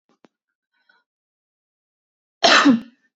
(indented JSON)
{
  "cough_length": "3.2 s",
  "cough_amplitude": 31135,
  "cough_signal_mean_std_ratio": 0.27,
  "survey_phase": "beta (2021-08-13 to 2022-03-07)",
  "age": "18-44",
  "gender": "Female",
  "wearing_mask": "No",
  "symptom_runny_or_blocked_nose": true,
  "symptom_onset": "12 days",
  "smoker_status": "Ex-smoker",
  "respiratory_condition_asthma": false,
  "respiratory_condition_other": false,
  "recruitment_source": "REACT",
  "submission_delay": "1 day",
  "covid_test_result": "Negative",
  "covid_test_method": "RT-qPCR",
  "influenza_a_test_result": "Negative",
  "influenza_b_test_result": "Negative"
}